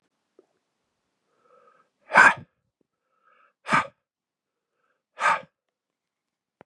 exhalation_length: 6.7 s
exhalation_amplitude: 26514
exhalation_signal_mean_std_ratio: 0.2
survey_phase: beta (2021-08-13 to 2022-03-07)
age: 45-64
gender: Male
wearing_mask: 'No'
symptom_runny_or_blocked_nose: true
symptom_abdominal_pain: true
symptom_fatigue: true
symptom_onset: 4 days
smoker_status: Never smoked
respiratory_condition_asthma: false
respiratory_condition_other: false
recruitment_source: Test and Trace
submission_delay: 1 day
covid_test_result: Positive
covid_test_method: RT-qPCR
covid_ct_value: 19.6
covid_ct_gene: ORF1ab gene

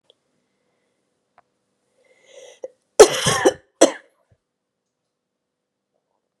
cough_length: 6.4 s
cough_amplitude: 32768
cough_signal_mean_std_ratio: 0.19
survey_phase: beta (2021-08-13 to 2022-03-07)
age: 18-44
gender: Female
wearing_mask: 'No'
symptom_cough_any: true
symptom_runny_or_blocked_nose: true
symptom_abdominal_pain: true
symptom_diarrhoea: true
symptom_headache: true
symptom_change_to_sense_of_smell_or_taste: true
symptom_onset: 3 days
smoker_status: Ex-smoker
respiratory_condition_asthma: true
respiratory_condition_other: false
recruitment_source: Test and Trace
submission_delay: 2 days
covid_test_result: Positive
covid_test_method: RT-qPCR
covid_ct_value: 21.3
covid_ct_gene: ORF1ab gene
covid_ct_mean: 21.5
covid_viral_load: 88000 copies/ml
covid_viral_load_category: Low viral load (10K-1M copies/ml)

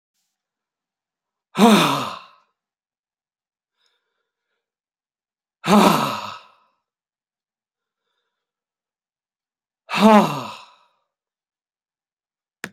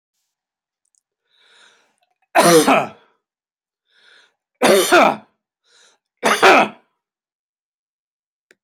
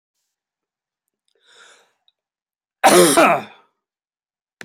exhalation_length: 12.7 s
exhalation_amplitude: 29420
exhalation_signal_mean_std_ratio: 0.26
three_cough_length: 8.6 s
three_cough_amplitude: 32768
three_cough_signal_mean_std_ratio: 0.32
cough_length: 4.6 s
cough_amplitude: 32767
cough_signal_mean_std_ratio: 0.28
survey_phase: beta (2021-08-13 to 2022-03-07)
age: 65+
gender: Male
wearing_mask: 'No'
symptom_other: true
smoker_status: Ex-smoker
respiratory_condition_asthma: true
respiratory_condition_other: false
recruitment_source: Test and Trace
submission_delay: 1 day
covid_test_result: Negative
covid_test_method: ePCR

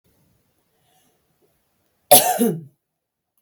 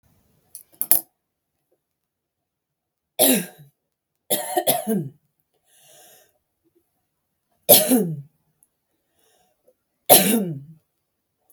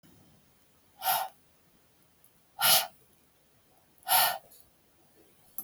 cough_length: 3.4 s
cough_amplitude: 32768
cough_signal_mean_std_ratio: 0.25
three_cough_length: 11.5 s
three_cough_amplitude: 32768
three_cough_signal_mean_std_ratio: 0.28
exhalation_length: 5.6 s
exhalation_amplitude: 11020
exhalation_signal_mean_std_ratio: 0.31
survey_phase: beta (2021-08-13 to 2022-03-07)
age: 18-44
gender: Female
wearing_mask: 'No'
symptom_runny_or_blocked_nose: true
symptom_headache: true
smoker_status: Ex-smoker
respiratory_condition_asthma: true
respiratory_condition_other: false
recruitment_source: REACT
submission_delay: 4 days
covid_test_result: Negative
covid_test_method: RT-qPCR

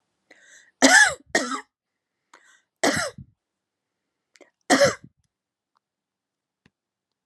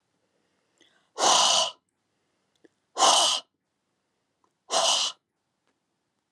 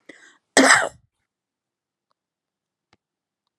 three_cough_length: 7.3 s
three_cough_amplitude: 30046
three_cough_signal_mean_std_ratio: 0.27
exhalation_length: 6.3 s
exhalation_amplitude: 15562
exhalation_signal_mean_std_ratio: 0.37
cough_length: 3.6 s
cough_amplitude: 32767
cough_signal_mean_std_ratio: 0.22
survey_phase: beta (2021-08-13 to 2022-03-07)
age: 65+
gender: Female
wearing_mask: 'No'
symptom_none: true
smoker_status: Never smoked
respiratory_condition_asthma: false
respiratory_condition_other: false
recruitment_source: REACT
submission_delay: 1 day
covid_test_result: Negative
covid_test_method: RT-qPCR
influenza_a_test_result: Negative
influenza_b_test_result: Negative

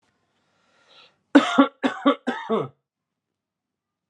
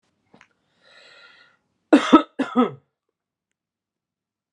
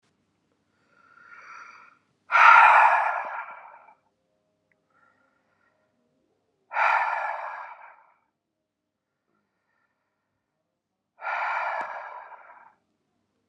three_cough_length: 4.1 s
three_cough_amplitude: 29744
three_cough_signal_mean_std_ratio: 0.3
cough_length: 4.5 s
cough_amplitude: 32767
cough_signal_mean_std_ratio: 0.22
exhalation_length: 13.5 s
exhalation_amplitude: 25208
exhalation_signal_mean_std_ratio: 0.3
survey_phase: alpha (2021-03-01 to 2021-08-12)
age: 18-44
gender: Male
wearing_mask: 'No'
symptom_none: true
smoker_status: Ex-smoker
respiratory_condition_asthma: false
respiratory_condition_other: false
recruitment_source: REACT
submission_delay: 3 days
covid_test_result: Negative
covid_test_method: RT-qPCR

